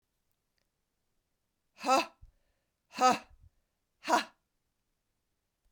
{"exhalation_length": "5.7 s", "exhalation_amplitude": 7755, "exhalation_signal_mean_std_ratio": 0.24, "survey_phase": "beta (2021-08-13 to 2022-03-07)", "age": "45-64", "gender": "Female", "wearing_mask": "No", "symptom_cough_any": true, "symptom_runny_or_blocked_nose": true, "symptom_shortness_of_breath": true, "symptom_sore_throat": true, "symptom_onset": "4 days", "smoker_status": "Never smoked", "respiratory_condition_asthma": false, "respiratory_condition_other": false, "recruitment_source": "Test and Trace", "submission_delay": "1 day", "covid_test_result": "Positive", "covid_test_method": "RT-qPCR", "covid_ct_value": 16.5, "covid_ct_gene": "ORF1ab gene"}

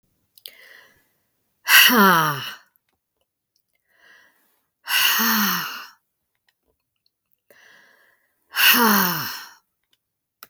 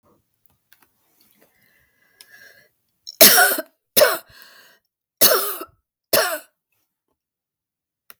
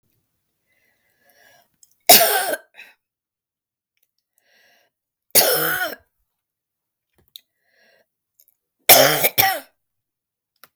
{"exhalation_length": "10.5 s", "exhalation_amplitude": 32768, "exhalation_signal_mean_std_ratio": 0.37, "cough_length": "8.2 s", "cough_amplitude": 32768, "cough_signal_mean_std_ratio": 0.28, "three_cough_length": "10.8 s", "three_cough_amplitude": 32768, "three_cough_signal_mean_std_ratio": 0.27, "survey_phase": "beta (2021-08-13 to 2022-03-07)", "age": "65+", "gender": "Female", "wearing_mask": "No", "symptom_new_continuous_cough": true, "smoker_status": "Never smoked", "respiratory_condition_asthma": false, "respiratory_condition_other": false, "recruitment_source": "Test and Trace", "submission_delay": "2 days", "covid_test_result": "Positive", "covid_test_method": "RT-qPCR", "covid_ct_value": 25.8, "covid_ct_gene": "N gene"}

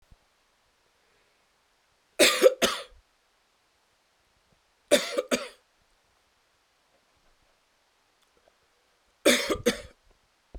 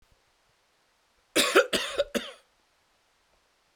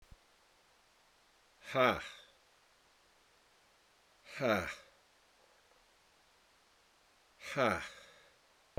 {"three_cough_length": "10.6 s", "three_cough_amplitude": 18112, "three_cough_signal_mean_std_ratio": 0.25, "cough_length": "3.8 s", "cough_amplitude": 18270, "cough_signal_mean_std_ratio": 0.3, "exhalation_length": "8.8 s", "exhalation_amplitude": 6147, "exhalation_signal_mean_std_ratio": 0.29, "survey_phase": "beta (2021-08-13 to 2022-03-07)", "age": "65+", "gender": "Male", "wearing_mask": "No", "symptom_runny_or_blocked_nose": true, "symptom_fever_high_temperature": true, "smoker_status": "Never smoked", "respiratory_condition_asthma": false, "respiratory_condition_other": false, "recruitment_source": "Test and Trace", "submission_delay": "1 day", "covid_test_result": "Positive", "covid_test_method": "RT-qPCR", "covid_ct_value": 15.5, "covid_ct_gene": "ORF1ab gene", "covid_ct_mean": 16.0, "covid_viral_load": "5800000 copies/ml", "covid_viral_load_category": "High viral load (>1M copies/ml)"}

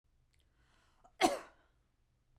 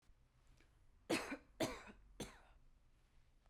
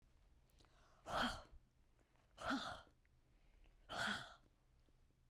{"cough_length": "2.4 s", "cough_amplitude": 5913, "cough_signal_mean_std_ratio": 0.21, "three_cough_length": "3.5 s", "three_cough_amplitude": 1504, "three_cough_signal_mean_std_ratio": 0.37, "exhalation_length": "5.3 s", "exhalation_amplitude": 1282, "exhalation_signal_mean_std_ratio": 0.42, "survey_phase": "beta (2021-08-13 to 2022-03-07)", "age": "45-64", "gender": "Female", "wearing_mask": "No", "symptom_fatigue": true, "smoker_status": "Never smoked", "respiratory_condition_asthma": false, "respiratory_condition_other": false, "recruitment_source": "REACT", "submission_delay": "2 days", "covid_test_result": "Negative", "covid_test_method": "RT-qPCR"}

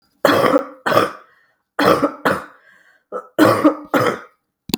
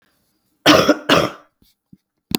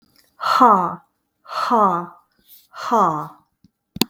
{"three_cough_length": "4.8 s", "three_cough_amplitude": 32768, "three_cough_signal_mean_std_ratio": 0.5, "cough_length": "2.4 s", "cough_amplitude": 32768, "cough_signal_mean_std_ratio": 0.37, "exhalation_length": "4.1 s", "exhalation_amplitude": 32766, "exhalation_signal_mean_std_ratio": 0.46, "survey_phase": "beta (2021-08-13 to 2022-03-07)", "age": "45-64", "gender": "Female", "wearing_mask": "No", "symptom_cough_any": true, "symptom_runny_or_blocked_nose": true, "symptom_shortness_of_breath": true, "symptom_sore_throat": true, "symptom_fatigue": true, "symptom_fever_high_temperature": true, "symptom_change_to_sense_of_smell_or_taste": true, "symptom_onset": "4 days", "smoker_status": "Ex-smoker", "respiratory_condition_asthma": false, "respiratory_condition_other": false, "recruitment_source": "Test and Trace", "submission_delay": "2 days", "covid_test_result": "Positive", "covid_test_method": "ePCR"}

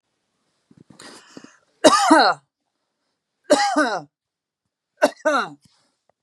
{"three_cough_length": "6.2 s", "three_cough_amplitude": 32767, "three_cough_signal_mean_std_ratio": 0.35, "survey_phase": "beta (2021-08-13 to 2022-03-07)", "age": "45-64", "gender": "Female", "wearing_mask": "No", "symptom_none": true, "smoker_status": "Never smoked", "respiratory_condition_asthma": false, "respiratory_condition_other": true, "recruitment_source": "REACT", "submission_delay": "0 days", "covid_test_result": "Negative", "covid_test_method": "RT-qPCR", "influenza_a_test_result": "Negative", "influenza_b_test_result": "Negative"}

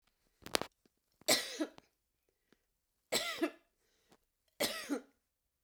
{"three_cough_length": "5.6 s", "three_cough_amplitude": 18933, "three_cough_signal_mean_std_ratio": 0.31, "survey_phase": "beta (2021-08-13 to 2022-03-07)", "age": "65+", "gender": "Female", "wearing_mask": "No", "symptom_none": true, "smoker_status": "Ex-smoker", "respiratory_condition_asthma": true, "respiratory_condition_other": false, "recruitment_source": "REACT", "submission_delay": "1 day", "covid_test_result": "Negative", "covid_test_method": "RT-qPCR", "influenza_a_test_result": "Negative", "influenza_b_test_result": "Negative"}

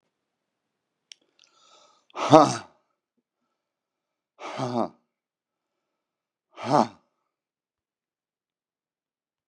{"exhalation_length": "9.5 s", "exhalation_amplitude": 32767, "exhalation_signal_mean_std_ratio": 0.18, "survey_phase": "beta (2021-08-13 to 2022-03-07)", "age": "65+", "gender": "Male", "wearing_mask": "No", "symptom_new_continuous_cough": true, "symptom_runny_or_blocked_nose": true, "symptom_sore_throat": true, "symptom_fatigue": true, "symptom_onset": "2 days", "smoker_status": "Ex-smoker", "respiratory_condition_asthma": false, "respiratory_condition_other": false, "recruitment_source": "Test and Trace", "submission_delay": "2 days", "covid_test_result": "Positive", "covid_test_method": "RT-qPCR", "covid_ct_value": 22.1, "covid_ct_gene": "ORF1ab gene", "covid_ct_mean": 22.6, "covid_viral_load": "37000 copies/ml", "covid_viral_load_category": "Low viral load (10K-1M copies/ml)"}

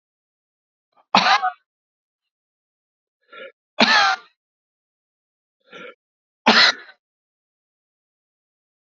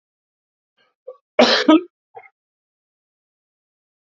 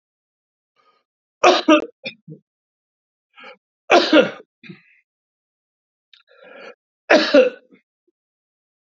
{"exhalation_length": "9.0 s", "exhalation_amplitude": 32074, "exhalation_signal_mean_std_ratio": 0.26, "cough_length": "4.2 s", "cough_amplitude": 28640, "cough_signal_mean_std_ratio": 0.23, "three_cough_length": "8.9 s", "three_cough_amplitude": 29109, "three_cough_signal_mean_std_ratio": 0.27, "survey_phase": "alpha (2021-03-01 to 2021-08-12)", "age": "45-64", "gender": "Male", "wearing_mask": "No", "symptom_cough_any": true, "symptom_shortness_of_breath": true, "symptom_fatigue": true, "symptom_fever_high_temperature": true, "symptom_headache": true, "symptom_onset": "2 days", "smoker_status": "Ex-smoker", "respiratory_condition_asthma": true, "respiratory_condition_other": true, "recruitment_source": "Test and Trace", "submission_delay": "2 days", "covid_test_result": "Positive", "covid_test_method": "RT-qPCR"}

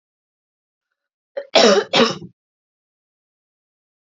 {"cough_length": "4.1 s", "cough_amplitude": 31484, "cough_signal_mean_std_ratio": 0.28, "survey_phase": "alpha (2021-03-01 to 2021-08-12)", "age": "18-44", "gender": "Female", "wearing_mask": "No", "symptom_none": true, "smoker_status": "Never smoked", "respiratory_condition_asthma": true, "respiratory_condition_other": false, "recruitment_source": "REACT", "submission_delay": "1 day", "covid_test_result": "Negative", "covid_test_method": "RT-qPCR"}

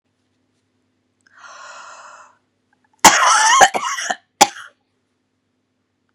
{"cough_length": "6.1 s", "cough_amplitude": 32768, "cough_signal_mean_std_ratio": 0.31, "survey_phase": "beta (2021-08-13 to 2022-03-07)", "age": "65+", "gender": "Female", "wearing_mask": "No", "symptom_cough_any": true, "symptom_new_continuous_cough": true, "symptom_sore_throat": true, "symptom_headache": true, "symptom_onset": "2 days", "smoker_status": "Ex-smoker", "respiratory_condition_asthma": false, "respiratory_condition_other": false, "recruitment_source": "Test and Trace", "submission_delay": "1 day", "covid_test_result": "Positive", "covid_test_method": "ePCR"}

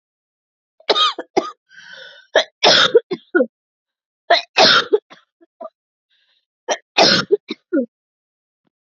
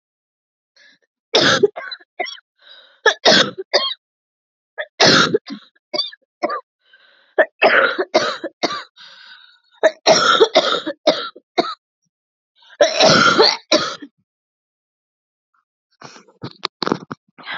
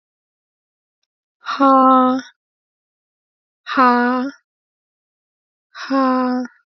{"three_cough_length": "9.0 s", "three_cough_amplitude": 32767, "three_cough_signal_mean_std_ratio": 0.36, "cough_length": "17.6 s", "cough_amplitude": 32768, "cough_signal_mean_std_ratio": 0.4, "exhalation_length": "6.7 s", "exhalation_amplitude": 23391, "exhalation_signal_mean_std_ratio": 0.43, "survey_phase": "beta (2021-08-13 to 2022-03-07)", "age": "18-44", "gender": "Female", "wearing_mask": "Yes", "symptom_new_continuous_cough": true, "smoker_status": "Never smoked", "respiratory_condition_asthma": false, "respiratory_condition_other": false, "recruitment_source": "Test and Trace", "submission_delay": "2 days", "covid_test_result": "Positive", "covid_test_method": "LFT"}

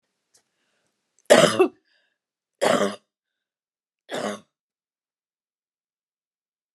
{"three_cough_length": "6.7 s", "three_cough_amplitude": 29203, "three_cough_signal_mean_std_ratio": 0.24, "survey_phase": "beta (2021-08-13 to 2022-03-07)", "age": "65+", "gender": "Female", "wearing_mask": "No", "symptom_none": true, "smoker_status": "Ex-smoker", "respiratory_condition_asthma": false, "respiratory_condition_other": false, "recruitment_source": "REACT", "submission_delay": "1 day", "covid_test_result": "Negative", "covid_test_method": "RT-qPCR"}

